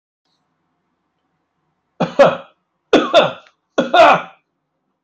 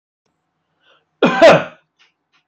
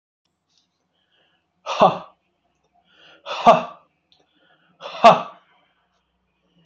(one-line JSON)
{"three_cough_length": "5.0 s", "three_cough_amplitude": 32768, "three_cough_signal_mean_std_ratio": 0.34, "cough_length": "2.5 s", "cough_amplitude": 29344, "cough_signal_mean_std_ratio": 0.31, "exhalation_length": "6.7 s", "exhalation_amplitude": 30727, "exhalation_signal_mean_std_ratio": 0.23, "survey_phase": "alpha (2021-03-01 to 2021-08-12)", "age": "65+", "gender": "Male", "wearing_mask": "No", "symptom_none": true, "smoker_status": "Never smoked", "respiratory_condition_asthma": true, "respiratory_condition_other": false, "recruitment_source": "REACT", "submission_delay": "1 day", "covid_test_result": "Negative", "covid_test_method": "RT-qPCR"}